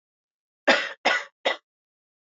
{
  "three_cough_length": "2.2 s",
  "three_cough_amplitude": 23933,
  "three_cough_signal_mean_std_ratio": 0.34,
  "survey_phase": "beta (2021-08-13 to 2022-03-07)",
  "age": "18-44",
  "gender": "Female",
  "wearing_mask": "No",
  "symptom_cough_any": true,
  "symptom_runny_or_blocked_nose": true,
  "symptom_abdominal_pain": true,
  "symptom_fatigue": true,
  "symptom_headache": true,
  "smoker_status": "Never smoked",
  "respiratory_condition_asthma": false,
  "respiratory_condition_other": false,
  "recruitment_source": "Test and Trace",
  "submission_delay": "2 days",
  "covid_test_result": "Positive",
  "covid_test_method": "RT-qPCR"
}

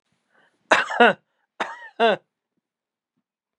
{
  "cough_length": "3.6 s",
  "cough_amplitude": 29503,
  "cough_signal_mean_std_ratio": 0.29,
  "survey_phase": "beta (2021-08-13 to 2022-03-07)",
  "age": "45-64",
  "gender": "Male",
  "wearing_mask": "No",
  "symptom_cough_any": true,
  "symptom_runny_or_blocked_nose": true,
  "symptom_sore_throat": true,
  "symptom_fatigue": true,
  "symptom_onset": "5 days",
  "smoker_status": "Never smoked",
  "respiratory_condition_asthma": false,
  "respiratory_condition_other": false,
  "recruitment_source": "REACT",
  "submission_delay": "1 day",
  "covid_test_result": "Negative",
  "covid_test_method": "RT-qPCR",
  "influenza_a_test_result": "Negative",
  "influenza_b_test_result": "Negative"
}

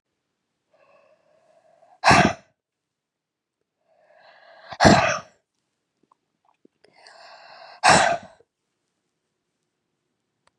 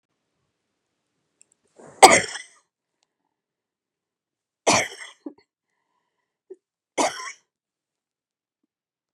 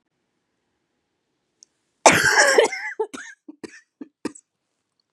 {
  "exhalation_length": "10.6 s",
  "exhalation_amplitude": 30667,
  "exhalation_signal_mean_std_ratio": 0.24,
  "three_cough_length": "9.1 s",
  "three_cough_amplitude": 32768,
  "three_cough_signal_mean_std_ratio": 0.17,
  "cough_length": "5.1 s",
  "cough_amplitude": 32767,
  "cough_signal_mean_std_ratio": 0.31,
  "survey_phase": "beta (2021-08-13 to 2022-03-07)",
  "age": "45-64",
  "gender": "Female",
  "wearing_mask": "No",
  "symptom_cough_any": true,
  "symptom_new_continuous_cough": true,
  "symptom_runny_or_blocked_nose": true,
  "symptom_sore_throat": true,
  "symptom_fatigue": true,
  "symptom_fever_high_temperature": true,
  "symptom_headache": true,
  "symptom_onset": "3 days",
  "smoker_status": "Never smoked",
  "respiratory_condition_asthma": false,
  "respiratory_condition_other": false,
  "recruitment_source": "Test and Trace",
  "submission_delay": "1 day",
  "covid_test_result": "Positive",
  "covid_test_method": "RT-qPCR",
  "covid_ct_value": 14.4,
  "covid_ct_gene": "N gene",
  "covid_ct_mean": 14.6,
  "covid_viral_load": "16000000 copies/ml",
  "covid_viral_load_category": "High viral load (>1M copies/ml)"
}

